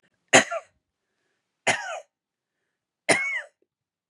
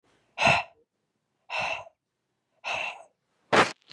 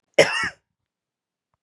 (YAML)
three_cough_length: 4.1 s
three_cough_amplitude: 29121
three_cough_signal_mean_std_ratio: 0.28
exhalation_length: 3.9 s
exhalation_amplitude: 14383
exhalation_signal_mean_std_ratio: 0.35
cough_length: 1.6 s
cough_amplitude: 29924
cough_signal_mean_std_ratio: 0.27
survey_phase: beta (2021-08-13 to 2022-03-07)
age: 18-44
gender: Female
wearing_mask: 'No'
symptom_runny_or_blocked_nose: true
symptom_sore_throat: true
symptom_fatigue: true
symptom_headache: true
smoker_status: Never smoked
respiratory_condition_asthma: true
respiratory_condition_other: false
recruitment_source: Test and Trace
submission_delay: 1 day
covid_test_result: Positive
covid_test_method: LFT